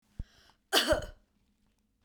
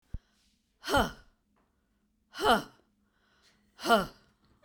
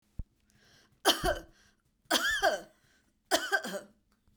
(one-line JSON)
{"cough_length": "2.0 s", "cough_amplitude": 12055, "cough_signal_mean_std_ratio": 0.32, "exhalation_length": "4.6 s", "exhalation_amplitude": 10580, "exhalation_signal_mean_std_ratio": 0.29, "three_cough_length": "4.4 s", "three_cough_amplitude": 11256, "three_cough_signal_mean_std_ratio": 0.4, "survey_phase": "beta (2021-08-13 to 2022-03-07)", "age": "45-64", "gender": "Female", "wearing_mask": "No", "symptom_none": true, "smoker_status": "Ex-smoker", "respiratory_condition_asthma": false, "respiratory_condition_other": false, "recruitment_source": "REACT", "submission_delay": "1 day", "covid_test_result": "Negative", "covid_test_method": "RT-qPCR"}